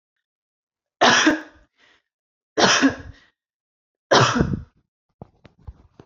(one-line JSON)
{"three_cough_length": "6.1 s", "three_cough_amplitude": 27343, "three_cough_signal_mean_std_ratio": 0.36, "survey_phase": "beta (2021-08-13 to 2022-03-07)", "age": "18-44", "gender": "Female", "wearing_mask": "No", "symptom_none": true, "smoker_status": "Never smoked", "respiratory_condition_asthma": false, "respiratory_condition_other": false, "recruitment_source": "Test and Trace", "submission_delay": "2 days", "covid_test_result": "Negative", "covid_test_method": "RT-qPCR"}